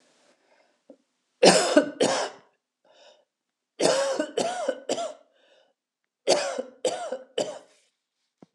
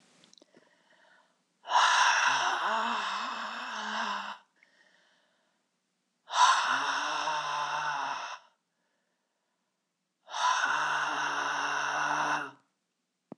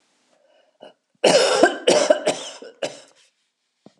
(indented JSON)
{
  "three_cough_length": "8.5 s",
  "three_cough_amplitude": 26028,
  "three_cough_signal_mean_std_ratio": 0.39,
  "exhalation_length": "13.4 s",
  "exhalation_amplitude": 9673,
  "exhalation_signal_mean_std_ratio": 0.6,
  "cough_length": "4.0 s",
  "cough_amplitude": 26028,
  "cough_signal_mean_std_ratio": 0.4,
  "survey_phase": "beta (2021-08-13 to 2022-03-07)",
  "age": "65+",
  "gender": "Female",
  "wearing_mask": "No",
  "symptom_cough_any": true,
  "symptom_runny_or_blocked_nose": true,
  "symptom_sore_throat": true,
  "symptom_fatigue": true,
  "symptom_headache": true,
  "symptom_onset": "3 days",
  "smoker_status": "Ex-smoker",
  "respiratory_condition_asthma": false,
  "respiratory_condition_other": false,
  "recruitment_source": "Test and Trace",
  "submission_delay": "2 days",
  "covid_test_result": "Positive",
  "covid_test_method": "RT-qPCR",
  "covid_ct_value": 26.6,
  "covid_ct_gene": "N gene"
}